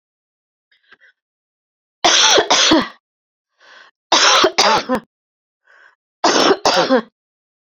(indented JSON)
{
  "three_cough_length": "7.7 s",
  "three_cough_amplitude": 32768,
  "three_cough_signal_mean_std_ratio": 0.45,
  "survey_phase": "beta (2021-08-13 to 2022-03-07)",
  "age": "45-64",
  "gender": "Female",
  "wearing_mask": "No",
  "symptom_cough_any": true,
  "symptom_fatigue": true,
  "symptom_headache": true,
  "symptom_loss_of_taste": true,
  "smoker_status": "Never smoked",
  "respiratory_condition_asthma": false,
  "respiratory_condition_other": false,
  "recruitment_source": "Test and Trace",
  "submission_delay": "2 days",
  "covid_test_result": "Positive",
  "covid_test_method": "RT-qPCR",
  "covid_ct_value": 16.2,
  "covid_ct_gene": "ORF1ab gene",
  "covid_ct_mean": 16.4,
  "covid_viral_load": "4300000 copies/ml",
  "covid_viral_load_category": "High viral load (>1M copies/ml)"
}